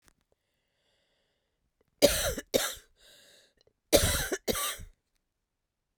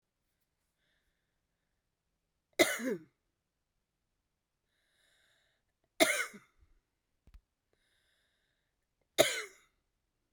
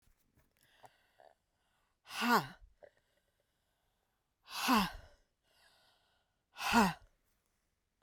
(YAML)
cough_length: 6.0 s
cough_amplitude: 20843
cough_signal_mean_std_ratio: 0.32
three_cough_length: 10.3 s
three_cough_amplitude: 10920
three_cough_signal_mean_std_ratio: 0.19
exhalation_length: 8.0 s
exhalation_amplitude: 5122
exhalation_signal_mean_std_ratio: 0.28
survey_phase: alpha (2021-03-01 to 2021-08-12)
age: 65+
gender: Female
wearing_mask: 'No'
symptom_cough_any: true
symptom_change_to_sense_of_smell_or_taste: true
symptom_loss_of_taste: true
symptom_onset: 4 days
smoker_status: Never smoked
respiratory_condition_asthma: false
respiratory_condition_other: false
recruitment_source: Test and Trace
submission_delay: 1 day
covid_test_result: Positive
covid_test_method: RT-qPCR
covid_ct_value: 17.8
covid_ct_gene: ORF1ab gene
covid_ct_mean: 18.4
covid_viral_load: 920000 copies/ml
covid_viral_load_category: Low viral load (10K-1M copies/ml)